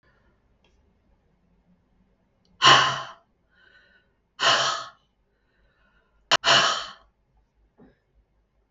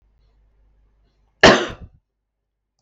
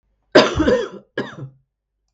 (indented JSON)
{
  "exhalation_length": "8.7 s",
  "exhalation_amplitude": 32433,
  "exhalation_signal_mean_std_ratio": 0.28,
  "cough_length": "2.8 s",
  "cough_amplitude": 32768,
  "cough_signal_mean_std_ratio": 0.22,
  "three_cough_length": "2.1 s",
  "three_cough_amplitude": 32768,
  "three_cough_signal_mean_std_ratio": 0.4,
  "survey_phase": "beta (2021-08-13 to 2022-03-07)",
  "age": "45-64",
  "gender": "Female",
  "wearing_mask": "No",
  "symptom_cough_any": true,
  "symptom_runny_or_blocked_nose": true,
  "symptom_abdominal_pain": true,
  "symptom_fatigue": true,
  "symptom_fever_high_temperature": true,
  "symptom_onset": "2 days",
  "smoker_status": "Never smoked",
  "respiratory_condition_asthma": false,
  "respiratory_condition_other": false,
  "recruitment_source": "Test and Trace",
  "submission_delay": "1 day",
  "covid_test_result": "Positive",
  "covid_test_method": "RT-qPCR",
  "covid_ct_value": 20.2,
  "covid_ct_gene": "N gene"
}